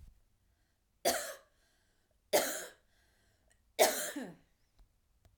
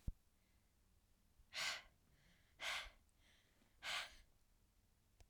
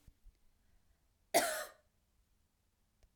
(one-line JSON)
{"three_cough_length": "5.4 s", "three_cough_amplitude": 7290, "three_cough_signal_mean_std_ratio": 0.3, "exhalation_length": "5.3 s", "exhalation_amplitude": 895, "exhalation_signal_mean_std_ratio": 0.38, "cough_length": "3.2 s", "cough_amplitude": 5126, "cough_signal_mean_std_ratio": 0.24, "survey_phase": "beta (2021-08-13 to 2022-03-07)", "age": "18-44", "gender": "Female", "wearing_mask": "No", "symptom_none": true, "smoker_status": "Ex-smoker", "respiratory_condition_asthma": false, "respiratory_condition_other": false, "recruitment_source": "REACT", "submission_delay": "1 day", "covid_test_result": "Negative", "covid_test_method": "RT-qPCR"}